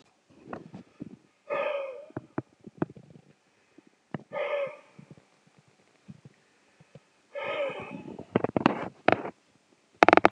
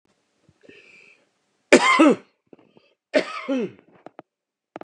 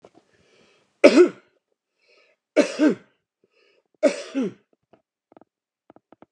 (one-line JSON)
{"exhalation_length": "10.3 s", "exhalation_amplitude": 32767, "exhalation_signal_mean_std_ratio": 0.26, "cough_length": "4.8 s", "cough_amplitude": 32767, "cough_signal_mean_std_ratio": 0.3, "three_cough_length": "6.3 s", "three_cough_amplitude": 32768, "three_cough_signal_mean_std_ratio": 0.26, "survey_phase": "beta (2021-08-13 to 2022-03-07)", "age": "45-64", "gender": "Male", "wearing_mask": "No", "symptom_none": true, "symptom_onset": "8 days", "smoker_status": "Ex-smoker", "respiratory_condition_asthma": false, "respiratory_condition_other": false, "recruitment_source": "REACT", "submission_delay": "3 days", "covid_test_result": "Negative", "covid_test_method": "RT-qPCR", "influenza_a_test_result": "Unknown/Void", "influenza_b_test_result": "Unknown/Void"}